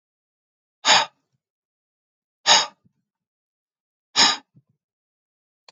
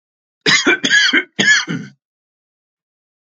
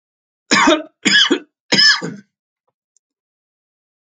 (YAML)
exhalation_length: 5.7 s
exhalation_amplitude: 27011
exhalation_signal_mean_std_ratio: 0.24
cough_length: 3.3 s
cough_amplitude: 32062
cough_signal_mean_std_ratio: 0.46
three_cough_length: 4.0 s
three_cough_amplitude: 32767
three_cough_signal_mean_std_ratio: 0.4
survey_phase: alpha (2021-03-01 to 2021-08-12)
age: 65+
gender: Male
wearing_mask: 'No'
symptom_none: true
smoker_status: Ex-smoker
respiratory_condition_asthma: false
respiratory_condition_other: false
recruitment_source: REACT
submission_delay: 2 days
covid_test_result: Negative
covid_test_method: RT-qPCR